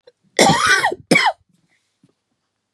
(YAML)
cough_length: 2.7 s
cough_amplitude: 32767
cough_signal_mean_std_ratio: 0.43
survey_phase: beta (2021-08-13 to 2022-03-07)
age: 45-64
gender: Female
wearing_mask: 'No'
symptom_cough_any: true
symptom_runny_or_blocked_nose: true
symptom_sore_throat: true
symptom_fatigue: true
symptom_headache: true
symptom_change_to_sense_of_smell_or_taste: true
symptom_loss_of_taste: true
symptom_onset: 4 days
smoker_status: Ex-smoker
respiratory_condition_asthma: false
respiratory_condition_other: false
recruitment_source: Test and Trace
submission_delay: 2 days
covid_test_result: Positive
covid_test_method: RT-qPCR
covid_ct_value: 20.8
covid_ct_gene: ORF1ab gene